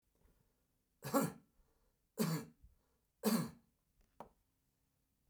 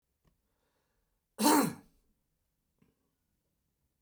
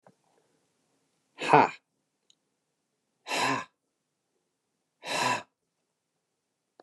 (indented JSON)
{
  "three_cough_length": "5.3 s",
  "three_cough_amplitude": 2658,
  "three_cough_signal_mean_std_ratio": 0.31,
  "cough_length": "4.0 s",
  "cough_amplitude": 7884,
  "cough_signal_mean_std_ratio": 0.23,
  "exhalation_length": "6.8 s",
  "exhalation_amplitude": 20105,
  "exhalation_signal_mean_std_ratio": 0.25,
  "survey_phase": "beta (2021-08-13 to 2022-03-07)",
  "age": "65+",
  "gender": "Male",
  "wearing_mask": "No",
  "symptom_none": true,
  "smoker_status": "Never smoked",
  "respiratory_condition_asthma": false,
  "respiratory_condition_other": false,
  "recruitment_source": "REACT",
  "submission_delay": "2 days",
  "covid_test_result": "Negative",
  "covid_test_method": "RT-qPCR",
  "influenza_a_test_result": "Negative",
  "influenza_b_test_result": "Negative"
}